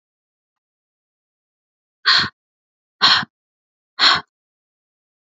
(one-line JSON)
{"exhalation_length": "5.4 s", "exhalation_amplitude": 30797, "exhalation_signal_mean_std_ratio": 0.26, "survey_phase": "beta (2021-08-13 to 2022-03-07)", "age": "18-44", "gender": "Female", "wearing_mask": "No", "symptom_none": true, "smoker_status": "Never smoked", "respiratory_condition_asthma": false, "respiratory_condition_other": false, "recruitment_source": "REACT", "submission_delay": "1 day", "covid_test_result": "Negative", "covid_test_method": "RT-qPCR"}